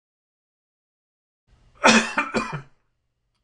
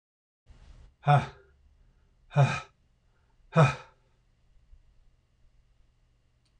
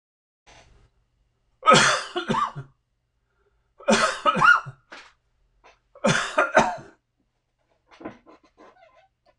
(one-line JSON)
{"cough_length": "3.4 s", "cough_amplitude": 25685, "cough_signal_mean_std_ratio": 0.28, "exhalation_length": "6.6 s", "exhalation_amplitude": 12676, "exhalation_signal_mean_std_ratio": 0.25, "three_cough_length": "9.4 s", "three_cough_amplitude": 23450, "three_cough_signal_mean_std_ratio": 0.35, "survey_phase": "beta (2021-08-13 to 2022-03-07)", "age": "65+", "gender": "Male", "wearing_mask": "No", "symptom_none": true, "smoker_status": "Ex-smoker", "respiratory_condition_asthma": true, "respiratory_condition_other": false, "recruitment_source": "REACT", "submission_delay": "3 days", "covid_test_result": "Negative", "covid_test_method": "RT-qPCR", "influenza_a_test_result": "Negative", "influenza_b_test_result": "Negative"}